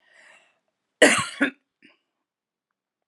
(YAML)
cough_length: 3.1 s
cough_amplitude: 31069
cough_signal_mean_std_ratio: 0.24
survey_phase: beta (2021-08-13 to 2022-03-07)
age: 45-64
gender: Female
wearing_mask: 'No'
symptom_none: true
smoker_status: Never smoked
respiratory_condition_asthma: false
respiratory_condition_other: false
recruitment_source: Test and Trace
submission_delay: 1 day
covid_test_result: Negative
covid_test_method: RT-qPCR